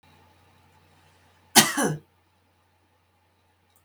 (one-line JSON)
{"cough_length": "3.8 s", "cough_amplitude": 32767, "cough_signal_mean_std_ratio": 0.21, "survey_phase": "beta (2021-08-13 to 2022-03-07)", "age": "65+", "gender": "Female", "wearing_mask": "No", "symptom_none": true, "smoker_status": "Ex-smoker", "respiratory_condition_asthma": false, "respiratory_condition_other": false, "recruitment_source": "REACT", "submission_delay": "2 days", "covid_test_result": "Negative", "covid_test_method": "RT-qPCR", "influenza_a_test_result": "Negative", "influenza_b_test_result": "Negative"}